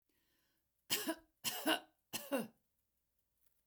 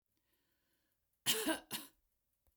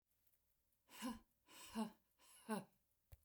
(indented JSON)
{
  "three_cough_length": "3.7 s",
  "three_cough_amplitude": 2967,
  "three_cough_signal_mean_std_ratio": 0.36,
  "cough_length": "2.6 s",
  "cough_amplitude": 4625,
  "cough_signal_mean_std_ratio": 0.31,
  "exhalation_length": "3.2 s",
  "exhalation_amplitude": 783,
  "exhalation_signal_mean_std_ratio": 0.38,
  "survey_phase": "beta (2021-08-13 to 2022-03-07)",
  "age": "65+",
  "gender": "Female",
  "wearing_mask": "No",
  "symptom_none": true,
  "smoker_status": "Never smoked",
  "respiratory_condition_asthma": false,
  "respiratory_condition_other": false,
  "recruitment_source": "REACT",
  "submission_delay": "1 day",
  "covid_test_result": "Negative",
  "covid_test_method": "RT-qPCR",
  "influenza_a_test_result": "Negative",
  "influenza_b_test_result": "Negative"
}